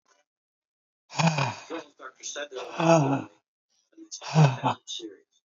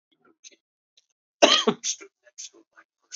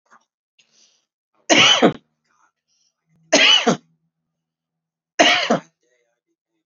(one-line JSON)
{"exhalation_length": "5.5 s", "exhalation_amplitude": 16546, "exhalation_signal_mean_std_ratio": 0.42, "cough_length": "3.2 s", "cough_amplitude": 27238, "cough_signal_mean_std_ratio": 0.25, "three_cough_length": "6.7 s", "three_cough_amplitude": 30155, "three_cough_signal_mean_std_ratio": 0.34, "survey_phase": "beta (2021-08-13 to 2022-03-07)", "age": "45-64", "gender": "Male", "wearing_mask": "No", "symptom_runny_or_blocked_nose": true, "symptom_sore_throat": true, "symptom_headache": true, "symptom_onset": "4 days", "smoker_status": "Never smoked", "respiratory_condition_asthma": true, "respiratory_condition_other": false, "recruitment_source": "Test and Trace", "submission_delay": "2 days", "covid_test_result": "Positive", "covid_test_method": "ePCR"}